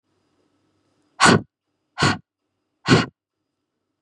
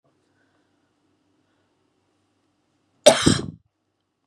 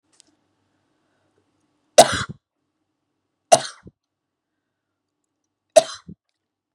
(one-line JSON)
{"exhalation_length": "4.0 s", "exhalation_amplitude": 31383, "exhalation_signal_mean_std_ratio": 0.28, "cough_length": "4.3 s", "cough_amplitude": 32768, "cough_signal_mean_std_ratio": 0.19, "three_cough_length": "6.7 s", "three_cough_amplitude": 32768, "three_cough_signal_mean_std_ratio": 0.16, "survey_phase": "beta (2021-08-13 to 2022-03-07)", "age": "18-44", "gender": "Female", "wearing_mask": "No", "symptom_cough_any": true, "symptom_runny_or_blocked_nose": true, "symptom_headache": true, "symptom_onset": "3 days", "smoker_status": "Never smoked", "respiratory_condition_asthma": false, "respiratory_condition_other": false, "recruitment_source": "Test and Trace", "submission_delay": "2 days", "covid_test_result": "Positive", "covid_test_method": "RT-qPCR", "covid_ct_value": 19.8, "covid_ct_gene": "ORF1ab gene"}